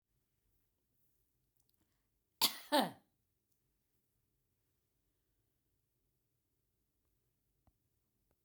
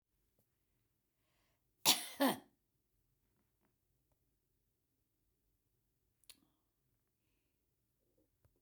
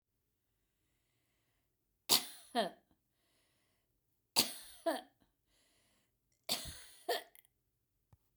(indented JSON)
{
  "cough_length": "8.4 s",
  "cough_amplitude": 5236,
  "cough_signal_mean_std_ratio": 0.15,
  "exhalation_length": "8.6 s",
  "exhalation_amplitude": 7548,
  "exhalation_signal_mean_std_ratio": 0.16,
  "three_cough_length": "8.4 s",
  "three_cough_amplitude": 7902,
  "three_cough_signal_mean_std_ratio": 0.25,
  "survey_phase": "beta (2021-08-13 to 2022-03-07)",
  "age": "65+",
  "gender": "Female",
  "wearing_mask": "No",
  "symptom_none": true,
  "smoker_status": "Never smoked",
  "respiratory_condition_asthma": false,
  "respiratory_condition_other": false,
  "recruitment_source": "REACT",
  "submission_delay": "2 days",
  "covid_test_result": "Negative",
  "covid_test_method": "RT-qPCR",
  "influenza_a_test_result": "Negative",
  "influenza_b_test_result": "Negative"
}